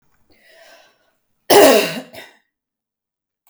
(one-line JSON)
{"cough_length": "3.5 s", "cough_amplitude": 32768, "cough_signal_mean_std_ratio": 0.28, "survey_phase": "beta (2021-08-13 to 2022-03-07)", "age": "45-64", "gender": "Female", "wearing_mask": "No", "symptom_none": true, "symptom_onset": "12 days", "smoker_status": "Never smoked", "respiratory_condition_asthma": false, "respiratory_condition_other": false, "recruitment_source": "REACT", "submission_delay": "1 day", "covid_test_result": "Negative", "covid_test_method": "RT-qPCR", "influenza_a_test_result": "Negative", "influenza_b_test_result": "Negative"}